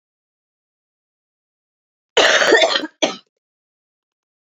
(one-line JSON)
{"cough_length": "4.4 s", "cough_amplitude": 30571, "cough_signal_mean_std_ratio": 0.32, "survey_phase": "beta (2021-08-13 to 2022-03-07)", "age": "45-64", "gender": "Female", "wearing_mask": "No", "symptom_cough_any": true, "symptom_sore_throat": true, "symptom_fatigue": true, "symptom_other": true, "smoker_status": "Ex-smoker", "respiratory_condition_asthma": false, "respiratory_condition_other": false, "recruitment_source": "Test and Trace", "submission_delay": "2 days", "covid_test_result": "Positive", "covid_test_method": "RT-qPCR", "covid_ct_value": 23.3, "covid_ct_gene": "N gene", "covid_ct_mean": 23.3, "covid_viral_load": "22000 copies/ml", "covid_viral_load_category": "Low viral load (10K-1M copies/ml)"}